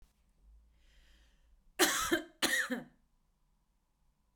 {"cough_length": "4.4 s", "cough_amplitude": 7269, "cough_signal_mean_std_ratio": 0.34, "survey_phase": "beta (2021-08-13 to 2022-03-07)", "age": "45-64", "gender": "Female", "wearing_mask": "No", "symptom_cough_any": true, "symptom_shortness_of_breath": true, "symptom_onset": "11 days", "smoker_status": "Ex-smoker", "respiratory_condition_asthma": false, "respiratory_condition_other": false, "recruitment_source": "REACT", "submission_delay": "0 days", "covid_test_result": "Negative", "covid_test_method": "RT-qPCR"}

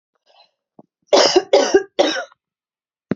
{"three_cough_length": "3.2 s", "three_cough_amplitude": 30826, "three_cough_signal_mean_std_ratio": 0.39, "survey_phase": "beta (2021-08-13 to 2022-03-07)", "age": "18-44", "gender": "Female", "wearing_mask": "No", "symptom_runny_or_blocked_nose": true, "symptom_onset": "8 days", "smoker_status": "Never smoked", "respiratory_condition_asthma": true, "respiratory_condition_other": false, "recruitment_source": "REACT", "submission_delay": "1 day", "covid_test_result": "Negative", "covid_test_method": "RT-qPCR", "influenza_a_test_result": "Negative", "influenza_b_test_result": "Negative"}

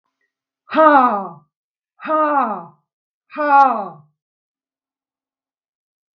{"exhalation_length": "6.1 s", "exhalation_amplitude": 32766, "exhalation_signal_mean_std_ratio": 0.38, "survey_phase": "beta (2021-08-13 to 2022-03-07)", "age": "65+", "gender": "Female", "wearing_mask": "No", "symptom_none": true, "smoker_status": "Never smoked", "respiratory_condition_asthma": false, "respiratory_condition_other": false, "recruitment_source": "REACT", "submission_delay": "1 day", "covid_test_result": "Negative", "covid_test_method": "RT-qPCR", "influenza_a_test_result": "Negative", "influenza_b_test_result": "Negative"}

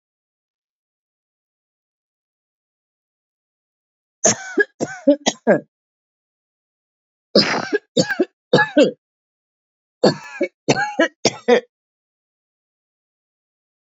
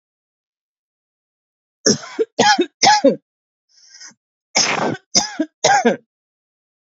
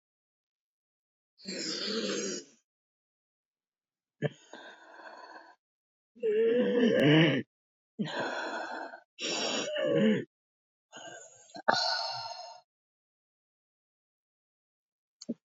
{"three_cough_length": "14.0 s", "three_cough_amplitude": 29015, "three_cough_signal_mean_std_ratio": 0.29, "cough_length": "7.0 s", "cough_amplitude": 32768, "cough_signal_mean_std_ratio": 0.38, "exhalation_length": "15.4 s", "exhalation_amplitude": 15785, "exhalation_signal_mean_std_ratio": 0.44, "survey_phase": "beta (2021-08-13 to 2022-03-07)", "age": "45-64", "gender": "Female", "wearing_mask": "No", "symptom_cough_any": true, "symptom_new_continuous_cough": true, "symptom_runny_or_blocked_nose": true, "symptom_shortness_of_breath": true, "symptom_diarrhoea": true, "symptom_fatigue": true, "symptom_fever_high_temperature": true, "symptom_headache": true, "symptom_change_to_sense_of_smell_or_taste": true, "symptom_loss_of_taste": true, "symptom_onset": "6 days", "smoker_status": "Ex-smoker", "respiratory_condition_asthma": false, "respiratory_condition_other": false, "recruitment_source": "Test and Trace", "submission_delay": "2 days", "covid_test_result": "Positive", "covid_test_method": "RT-qPCR"}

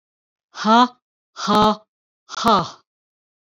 {"exhalation_length": "3.5 s", "exhalation_amplitude": 25471, "exhalation_signal_mean_std_ratio": 0.39, "survey_phase": "beta (2021-08-13 to 2022-03-07)", "age": "45-64", "gender": "Female", "wearing_mask": "No", "symptom_none": true, "smoker_status": "Never smoked", "respiratory_condition_asthma": false, "respiratory_condition_other": false, "recruitment_source": "REACT", "submission_delay": "1 day", "covid_test_result": "Negative", "covid_test_method": "RT-qPCR"}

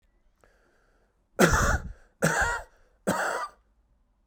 {"three_cough_length": "4.3 s", "three_cough_amplitude": 18723, "three_cough_signal_mean_std_ratio": 0.42, "survey_phase": "beta (2021-08-13 to 2022-03-07)", "age": "18-44", "gender": "Male", "wearing_mask": "No", "symptom_none": true, "smoker_status": "Never smoked", "respiratory_condition_asthma": false, "respiratory_condition_other": false, "recruitment_source": "REACT", "submission_delay": "10 days", "covid_test_result": "Negative", "covid_test_method": "RT-qPCR", "covid_ct_value": 46.0, "covid_ct_gene": "N gene"}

